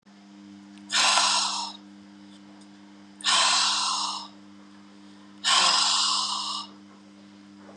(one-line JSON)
{"exhalation_length": "7.8 s", "exhalation_amplitude": 19653, "exhalation_signal_mean_std_ratio": 0.58, "survey_phase": "beta (2021-08-13 to 2022-03-07)", "age": "45-64", "gender": "Female", "wearing_mask": "No", "symptom_cough_any": true, "symptom_runny_or_blocked_nose": true, "symptom_fatigue": true, "symptom_fever_high_temperature": true, "symptom_headache": true, "symptom_other": true, "smoker_status": "Never smoked", "respiratory_condition_asthma": false, "respiratory_condition_other": false, "recruitment_source": "Test and Trace", "submission_delay": "1 day", "covid_test_result": "Positive", "covid_test_method": "RT-qPCR", "covid_ct_value": 30.8, "covid_ct_gene": "N gene"}